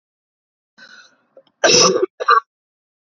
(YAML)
cough_length: 3.1 s
cough_amplitude: 31473
cough_signal_mean_std_ratio: 0.35
survey_phase: beta (2021-08-13 to 2022-03-07)
age: 45-64
gender: Female
wearing_mask: 'No'
symptom_cough_any: true
symptom_runny_or_blocked_nose: true
symptom_shortness_of_breath: true
symptom_sore_throat: true
symptom_fatigue: true
symptom_fever_high_temperature: true
symptom_headache: true
symptom_change_to_sense_of_smell_or_taste: true
symptom_loss_of_taste: true
symptom_onset: 2 days
smoker_status: Never smoked
respiratory_condition_asthma: false
respiratory_condition_other: false
recruitment_source: Test and Trace
submission_delay: 1 day
covid_test_result: Positive
covid_test_method: ePCR